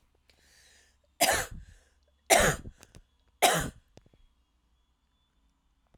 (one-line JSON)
{"three_cough_length": "6.0 s", "three_cough_amplitude": 16641, "three_cough_signal_mean_std_ratio": 0.29, "survey_phase": "alpha (2021-03-01 to 2021-08-12)", "age": "45-64", "gender": "Female", "wearing_mask": "No", "symptom_none": true, "smoker_status": "Never smoked", "respiratory_condition_asthma": false, "respiratory_condition_other": false, "recruitment_source": "REACT", "submission_delay": "1 day", "covid_test_result": "Negative", "covid_test_method": "RT-qPCR"}